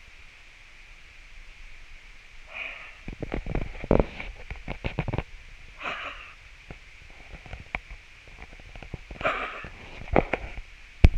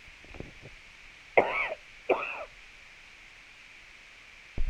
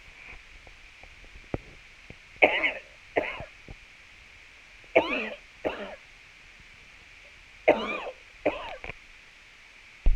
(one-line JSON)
{"exhalation_length": "11.2 s", "exhalation_amplitude": 32767, "exhalation_signal_mean_std_ratio": 0.37, "cough_length": "4.7 s", "cough_amplitude": 16342, "cough_signal_mean_std_ratio": 0.38, "three_cough_length": "10.2 s", "three_cough_amplitude": 27557, "three_cough_signal_mean_std_ratio": 0.34, "survey_phase": "alpha (2021-03-01 to 2021-08-12)", "age": "45-64", "gender": "Female", "wearing_mask": "No", "symptom_shortness_of_breath": true, "symptom_onset": "12 days", "smoker_status": "Never smoked", "respiratory_condition_asthma": true, "respiratory_condition_other": false, "recruitment_source": "REACT", "submission_delay": "1 day", "covid_test_result": "Negative", "covid_test_method": "RT-qPCR"}